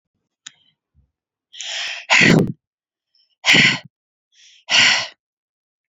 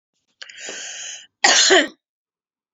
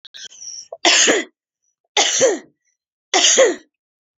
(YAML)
exhalation_length: 5.9 s
exhalation_amplitude: 29696
exhalation_signal_mean_std_ratio: 0.37
cough_length: 2.7 s
cough_amplitude: 30419
cough_signal_mean_std_ratio: 0.38
three_cough_length: 4.2 s
three_cough_amplitude: 29745
three_cough_signal_mean_std_ratio: 0.47
survey_phase: beta (2021-08-13 to 2022-03-07)
age: 18-44
gender: Female
wearing_mask: 'No'
symptom_runny_or_blocked_nose: true
symptom_onset: 5 days
smoker_status: Never smoked
respiratory_condition_asthma: false
respiratory_condition_other: false
recruitment_source: REACT
submission_delay: 1 day
covid_test_result: Positive
covid_test_method: RT-qPCR
covid_ct_value: 24.0
covid_ct_gene: E gene
influenza_a_test_result: Negative
influenza_b_test_result: Negative